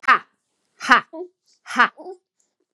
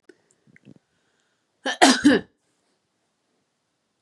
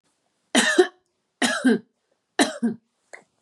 {"exhalation_length": "2.7 s", "exhalation_amplitude": 32767, "exhalation_signal_mean_std_ratio": 0.29, "cough_length": "4.0 s", "cough_amplitude": 32321, "cough_signal_mean_std_ratio": 0.24, "three_cough_length": "3.4 s", "three_cough_amplitude": 22220, "three_cough_signal_mean_std_ratio": 0.4, "survey_phase": "beta (2021-08-13 to 2022-03-07)", "age": "18-44", "gender": "Female", "wearing_mask": "No", "symptom_none": true, "smoker_status": "Never smoked", "respiratory_condition_asthma": true, "respiratory_condition_other": false, "recruitment_source": "REACT", "submission_delay": "1 day", "covid_test_result": "Negative", "covid_test_method": "RT-qPCR", "influenza_a_test_result": "Negative", "influenza_b_test_result": "Negative"}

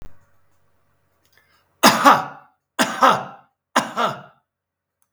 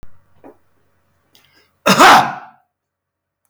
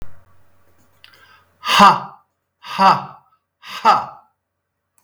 {"three_cough_length": "5.1 s", "three_cough_amplitude": 32766, "three_cough_signal_mean_std_ratio": 0.34, "cough_length": "3.5 s", "cough_amplitude": 32768, "cough_signal_mean_std_ratio": 0.31, "exhalation_length": "5.0 s", "exhalation_amplitude": 32768, "exhalation_signal_mean_std_ratio": 0.34, "survey_phase": "beta (2021-08-13 to 2022-03-07)", "age": "65+", "gender": "Male", "wearing_mask": "No", "symptom_none": true, "smoker_status": "Ex-smoker", "respiratory_condition_asthma": false, "respiratory_condition_other": false, "recruitment_source": "REACT", "submission_delay": "1 day", "covid_test_result": "Negative", "covid_test_method": "RT-qPCR", "influenza_a_test_result": "Negative", "influenza_b_test_result": "Negative"}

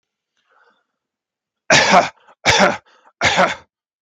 {"three_cough_length": "4.0 s", "three_cough_amplitude": 32768, "three_cough_signal_mean_std_ratio": 0.4, "survey_phase": "beta (2021-08-13 to 2022-03-07)", "age": "18-44", "gender": "Male", "wearing_mask": "No", "symptom_none": true, "smoker_status": "Never smoked", "respiratory_condition_asthma": false, "respiratory_condition_other": false, "recruitment_source": "REACT", "submission_delay": "3 days", "covid_test_result": "Negative", "covid_test_method": "RT-qPCR", "influenza_a_test_result": "Negative", "influenza_b_test_result": "Negative"}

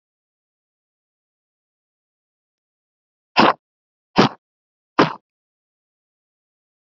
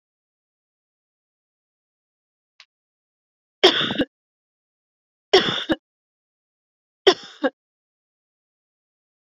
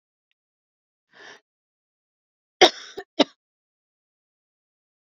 {"exhalation_length": "7.0 s", "exhalation_amplitude": 28150, "exhalation_signal_mean_std_ratio": 0.17, "three_cough_length": "9.3 s", "three_cough_amplitude": 29349, "three_cough_signal_mean_std_ratio": 0.21, "cough_length": "5.0 s", "cough_amplitude": 32266, "cough_signal_mean_std_ratio": 0.13, "survey_phase": "beta (2021-08-13 to 2022-03-07)", "age": "18-44", "gender": "Female", "wearing_mask": "No", "symptom_cough_any": true, "symptom_new_continuous_cough": true, "symptom_runny_or_blocked_nose": true, "symptom_shortness_of_breath": true, "symptom_sore_throat": true, "symptom_fatigue": true, "symptom_headache": true, "symptom_change_to_sense_of_smell_or_taste": true, "symptom_loss_of_taste": true, "symptom_onset": "4 days", "smoker_status": "Ex-smoker", "respiratory_condition_asthma": false, "respiratory_condition_other": false, "recruitment_source": "Test and Trace", "submission_delay": "4 days", "covid_test_result": "Negative", "covid_test_method": "LAMP"}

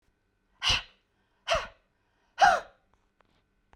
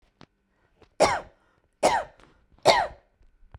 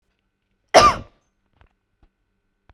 {"exhalation_length": "3.8 s", "exhalation_amplitude": 12257, "exhalation_signal_mean_std_ratio": 0.29, "three_cough_length": "3.6 s", "three_cough_amplitude": 20994, "three_cough_signal_mean_std_ratio": 0.33, "cough_length": "2.7 s", "cough_amplitude": 32768, "cough_signal_mean_std_ratio": 0.22, "survey_phase": "beta (2021-08-13 to 2022-03-07)", "age": "18-44", "gender": "Female", "wearing_mask": "No", "symptom_shortness_of_breath": true, "symptom_abdominal_pain": true, "symptom_fatigue": true, "symptom_onset": "6 days", "smoker_status": "Never smoked", "respiratory_condition_asthma": true, "respiratory_condition_other": true, "recruitment_source": "REACT", "submission_delay": "2 days", "covid_test_result": "Negative", "covid_test_method": "RT-qPCR", "influenza_a_test_result": "Negative", "influenza_b_test_result": "Negative"}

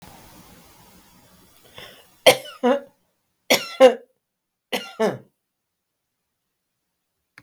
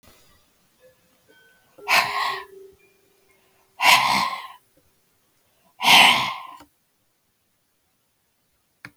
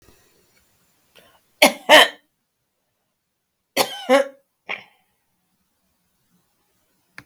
{"three_cough_length": "7.4 s", "three_cough_amplitude": 32768, "three_cough_signal_mean_std_ratio": 0.24, "exhalation_length": "9.0 s", "exhalation_amplitude": 32703, "exhalation_signal_mean_std_ratio": 0.31, "cough_length": "7.3 s", "cough_amplitude": 32768, "cough_signal_mean_std_ratio": 0.22, "survey_phase": "beta (2021-08-13 to 2022-03-07)", "age": "65+", "gender": "Female", "wearing_mask": "No", "symptom_none": true, "smoker_status": "Ex-smoker", "respiratory_condition_asthma": false, "respiratory_condition_other": false, "recruitment_source": "REACT", "submission_delay": "2 days", "covid_test_result": "Negative", "covid_test_method": "RT-qPCR"}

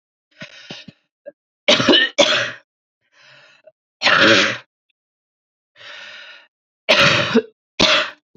{"three_cough_length": "8.4 s", "three_cough_amplitude": 31227, "three_cough_signal_mean_std_ratio": 0.41, "survey_phase": "beta (2021-08-13 to 2022-03-07)", "age": "18-44", "gender": "Female", "wearing_mask": "No", "symptom_runny_or_blocked_nose": true, "symptom_headache": true, "symptom_change_to_sense_of_smell_or_taste": true, "symptom_loss_of_taste": true, "symptom_onset": "5 days", "smoker_status": "Current smoker (1 to 10 cigarettes per day)", "respiratory_condition_asthma": false, "respiratory_condition_other": false, "recruitment_source": "Test and Trace", "submission_delay": "2 days", "covid_test_result": "Positive", "covid_test_method": "RT-qPCR"}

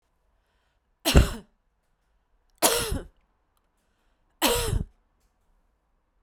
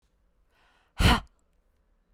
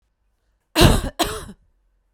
{"three_cough_length": "6.2 s", "three_cough_amplitude": 32767, "three_cough_signal_mean_std_ratio": 0.29, "exhalation_length": "2.1 s", "exhalation_amplitude": 13290, "exhalation_signal_mean_std_ratio": 0.25, "cough_length": "2.1 s", "cough_amplitude": 32767, "cough_signal_mean_std_ratio": 0.34, "survey_phase": "beta (2021-08-13 to 2022-03-07)", "age": "45-64", "gender": "Female", "wearing_mask": "No", "symptom_change_to_sense_of_smell_or_taste": true, "symptom_onset": "2 days", "smoker_status": "Ex-smoker", "respiratory_condition_asthma": false, "respiratory_condition_other": false, "recruitment_source": "Test and Trace", "submission_delay": "1 day", "covid_test_result": "Positive", "covid_test_method": "RT-qPCR", "covid_ct_value": 16.4, "covid_ct_gene": "ORF1ab gene", "covid_ct_mean": 16.6, "covid_viral_load": "3700000 copies/ml", "covid_viral_load_category": "High viral load (>1M copies/ml)"}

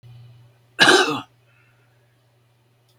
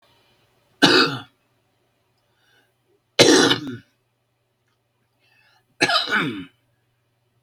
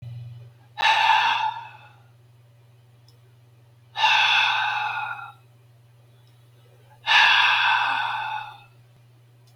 {"cough_length": "3.0 s", "cough_amplitude": 31327, "cough_signal_mean_std_ratio": 0.29, "three_cough_length": "7.4 s", "three_cough_amplitude": 32768, "three_cough_signal_mean_std_ratio": 0.32, "exhalation_length": "9.6 s", "exhalation_amplitude": 21204, "exhalation_signal_mean_std_ratio": 0.52, "survey_phase": "beta (2021-08-13 to 2022-03-07)", "age": "65+", "gender": "Male", "wearing_mask": "No", "symptom_cough_any": true, "symptom_shortness_of_breath": true, "smoker_status": "Ex-smoker", "respiratory_condition_asthma": true, "respiratory_condition_other": true, "recruitment_source": "REACT", "submission_delay": "0 days", "covid_test_result": "Negative", "covid_test_method": "RT-qPCR", "influenza_a_test_result": "Negative", "influenza_b_test_result": "Negative"}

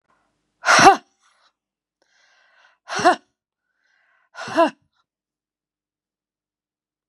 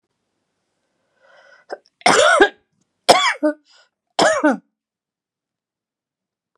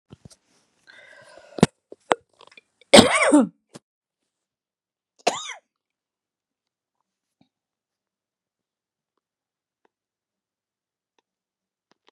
{"exhalation_length": "7.1 s", "exhalation_amplitude": 32768, "exhalation_signal_mean_std_ratio": 0.23, "three_cough_length": "6.6 s", "three_cough_amplitude": 32768, "three_cough_signal_mean_std_ratio": 0.32, "cough_length": "12.1 s", "cough_amplitude": 32768, "cough_signal_mean_std_ratio": 0.17, "survey_phase": "beta (2021-08-13 to 2022-03-07)", "age": "45-64", "gender": "Female", "wearing_mask": "No", "symptom_none": true, "smoker_status": "Never smoked", "respiratory_condition_asthma": false, "respiratory_condition_other": false, "recruitment_source": "REACT", "submission_delay": "1 day", "covid_test_result": "Negative", "covid_test_method": "RT-qPCR"}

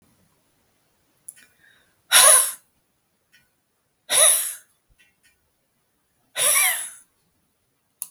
{"exhalation_length": "8.1 s", "exhalation_amplitude": 32766, "exhalation_signal_mean_std_ratio": 0.3, "survey_phase": "beta (2021-08-13 to 2022-03-07)", "age": "65+", "gender": "Female", "wearing_mask": "No", "symptom_runny_or_blocked_nose": true, "symptom_sore_throat": true, "smoker_status": "Never smoked", "respiratory_condition_asthma": false, "respiratory_condition_other": false, "recruitment_source": "REACT", "submission_delay": "1 day", "covid_test_result": "Negative", "covid_test_method": "RT-qPCR"}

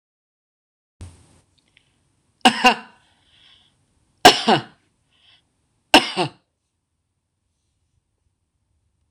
{"three_cough_length": "9.1 s", "three_cough_amplitude": 26028, "three_cough_signal_mean_std_ratio": 0.2, "survey_phase": "beta (2021-08-13 to 2022-03-07)", "age": "45-64", "gender": "Female", "wearing_mask": "No", "symptom_headache": true, "symptom_onset": "5 days", "smoker_status": "Current smoker (1 to 10 cigarettes per day)", "respiratory_condition_asthma": false, "respiratory_condition_other": false, "recruitment_source": "REACT", "submission_delay": "11 days", "covid_test_result": "Negative", "covid_test_method": "RT-qPCR"}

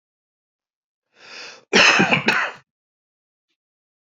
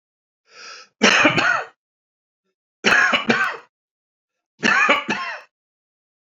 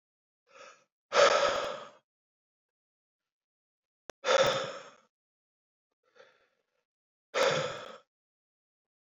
{"cough_length": "4.0 s", "cough_amplitude": 28039, "cough_signal_mean_std_ratio": 0.34, "three_cough_length": "6.3 s", "three_cough_amplitude": 32767, "three_cough_signal_mean_std_ratio": 0.44, "exhalation_length": "9.0 s", "exhalation_amplitude": 9564, "exhalation_signal_mean_std_ratio": 0.31, "survey_phase": "beta (2021-08-13 to 2022-03-07)", "age": "45-64", "gender": "Male", "wearing_mask": "No", "symptom_cough_any": true, "symptom_runny_or_blocked_nose": true, "symptom_sore_throat": true, "symptom_loss_of_taste": true, "symptom_onset": "2 days", "smoker_status": "Current smoker (1 to 10 cigarettes per day)", "respiratory_condition_asthma": false, "respiratory_condition_other": false, "recruitment_source": "Test and Trace", "submission_delay": "2 days", "covid_test_result": "Positive", "covid_test_method": "RT-qPCR", "covid_ct_value": 16.8, "covid_ct_gene": "ORF1ab gene", "covid_ct_mean": 17.5, "covid_viral_load": "1900000 copies/ml", "covid_viral_load_category": "High viral load (>1M copies/ml)"}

